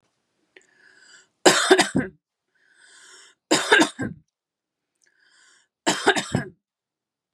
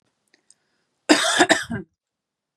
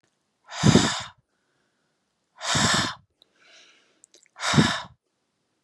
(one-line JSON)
{"three_cough_length": "7.3 s", "three_cough_amplitude": 32642, "three_cough_signal_mean_std_ratio": 0.31, "cough_length": "2.6 s", "cough_amplitude": 31449, "cough_signal_mean_std_ratio": 0.34, "exhalation_length": "5.6 s", "exhalation_amplitude": 23995, "exhalation_signal_mean_std_ratio": 0.36, "survey_phase": "beta (2021-08-13 to 2022-03-07)", "age": "18-44", "gender": "Female", "wearing_mask": "No", "symptom_runny_or_blocked_nose": true, "symptom_headache": true, "smoker_status": "Ex-smoker", "respiratory_condition_asthma": false, "respiratory_condition_other": false, "recruitment_source": "Test and Trace", "submission_delay": "2 days", "covid_test_result": "Positive", "covid_test_method": "RT-qPCR", "covid_ct_value": 23.5, "covid_ct_gene": "ORF1ab gene"}